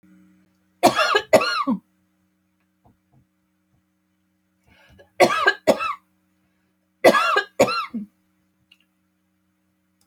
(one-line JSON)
{"cough_length": "10.1 s", "cough_amplitude": 29207, "cough_signal_mean_std_ratio": 0.33, "survey_phase": "alpha (2021-03-01 to 2021-08-12)", "age": "45-64", "gender": "Female", "wearing_mask": "No", "symptom_none": true, "smoker_status": "Never smoked", "respiratory_condition_asthma": true, "respiratory_condition_other": false, "recruitment_source": "REACT", "submission_delay": "2 days", "covid_test_result": "Negative", "covid_test_method": "RT-qPCR"}